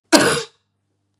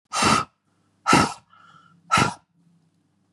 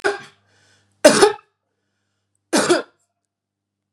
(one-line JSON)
{"cough_length": "1.2 s", "cough_amplitude": 32768, "cough_signal_mean_std_ratio": 0.38, "exhalation_length": "3.3 s", "exhalation_amplitude": 25617, "exhalation_signal_mean_std_ratio": 0.38, "three_cough_length": "3.9 s", "three_cough_amplitude": 32768, "three_cough_signal_mean_std_ratio": 0.3, "survey_phase": "beta (2021-08-13 to 2022-03-07)", "age": "45-64", "gender": "Female", "wearing_mask": "No", "symptom_none": true, "smoker_status": "Never smoked", "respiratory_condition_asthma": false, "respiratory_condition_other": false, "recruitment_source": "Test and Trace", "submission_delay": "1 day", "covid_test_result": "Negative", "covid_test_method": "RT-qPCR"}